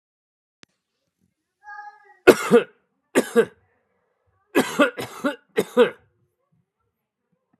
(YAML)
cough_length: 7.6 s
cough_amplitude: 32768
cough_signal_mean_std_ratio: 0.27
survey_phase: alpha (2021-03-01 to 2021-08-12)
age: 45-64
gender: Male
wearing_mask: 'No'
symptom_none: true
smoker_status: Never smoked
respiratory_condition_asthma: false
respiratory_condition_other: false
recruitment_source: REACT
submission_delay: 2 days
covid_test_result: Negative
covid_test_method: RT-qPCR